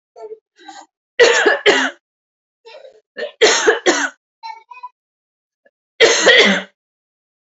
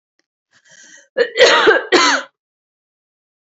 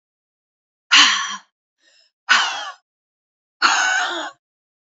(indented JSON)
{
  "three_cough_length": "7.5 s",
  "three_cough_amplitude": 30657,
  "three_cough_signal_mean_std_ratio": 0.42,
  "cough_length": "3.6 s",
  "cough_amplitude": 30310,
  "cough_signal_mean_std_ratio": 0.4,
  "exhalation_length": "4.9 s",
  "exhalation_amplitude": 32031,
  "exhalation_signal_mean_std_ratio": 0.4,
  "survey_phase": "beta (2021-08-13 to 2022-03-07)",
  "age": "18-44",
  "gender": "Female",
  "wearing_mask": "No",
  "symptom_none": true,
  "smoker_status": "Never smoked",
  "respiratory_condition_asthma": false,
  "respiratory_condition_other": false,
  "recruitment_source": "REACT",
  "submission_delay": "2 days",
  "covid_test_result": "Negative",
  "covid_test_method": "RT-qPCR",
  "influenza_a_test_result": "Negative",
  "influenza_b_test_result": "Negative"
}